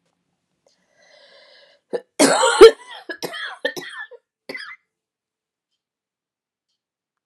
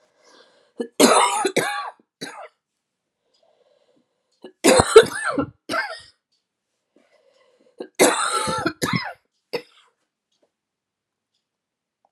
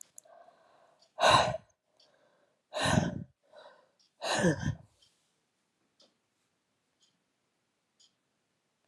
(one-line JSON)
{"cough_length": "7.3 s", "cough_amplitude": 32768, "cough_signal_mean_std_ratio": 0.22, "three_cough_length": "12.1 s", "three_cough_amplitude": 32768, "three_cough_signal_mean_std_ratio": 0.32, "exhalation_length": "8.9 s", "exhalation_amplitude": 10470, "exhalation_signal_mean_std_ratio": 0.29, "survey_phase": "alpha (2021-03-01 to 2021-08-12)", "age": "45-64", "gender": "Female", "wearing_mask": "No", "symptom_cough_any": true, "symptom_shortness_of_breath": true, "symptom_fatigue": true, "symptom_fever_high_temperature": true, "symptom_headache": true, "symptom_change_to_sense_of_smell_or_taste": true, "symptom_loss_of_taste": true, "symptom_onset": "3 days", "smoker_status": "Ex-smoker", "respiratory_condition_asthma": false, "respiratory_condition_other": false, "recruitment_source": "Test and Trace", "submission_delay": "2 days", "covid_test_result": "Positive", "covid_test_method": "RT-qPCR", "covid_ct_value": 19.7, "covid_ct_gene": "N gene"}